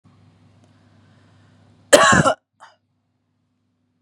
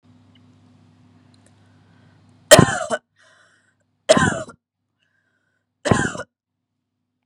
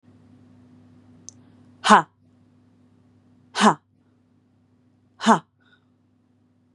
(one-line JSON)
{"cough_length": "4.0 s", "cough_amplitude": 32768, "cough_signal_mean_std_ratio": 0.25, "three_cough_length": "7.3 s", "three_cough_amplitude": 32768, "three_cough_signal_mean_std_ratio": 0.24, "exhalation_length": "6.7 s", "exhalation_amplitude": 32767, "exhalation_signal_mean_std_ratio": 0.21, "survey_phase": "beta (2021-08-13 to 2022-03-07)", "age": "18-44", "gender": "Female", "wearing_mask": "No", "symptom_none": true, "smoker_status": "Never smoked", "respiratory_condition_asthma": false, "respiratory_condition_other": false, "recruitment_source": "REACT", "submission_delay": "1 day", "covid_test_result": "Negative", "covid_test_method": "RT-qPCR", "influenza_a_test_result": "Negative", "influenza_b_test_result": "Negative"}